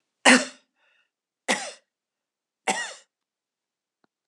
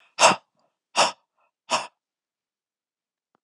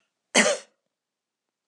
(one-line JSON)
{"three_cough_length": "4.3 s", "three_cough_amplitude": 29474, "three_cough_signal_mean_std_ratio": 0.23, "exhalation_length": "3.4 s", "exhalation_amplitude": 30041, "exhalation_signal_mean_std_ratio": 0.25, "cough_length": "1.7 s", "cough_amplitude": 20743, "cough_signal_mean_std_ratio": 0.28, "survey_phase": "alpha (2021-03-01 to 2021-08-12)", "age": "65+", "gender": "Female", "wearing_mask": "No", "symptom_none": true, "smoker_status": "Never smoked", "respiratory_condition_asthma": false, "respiratory_condition_other": false, "recruitment_source": "REACT", "submission_delay": "1 day", "covid_test_result": "Negative", "covid_test_method": "RT-qPCR"}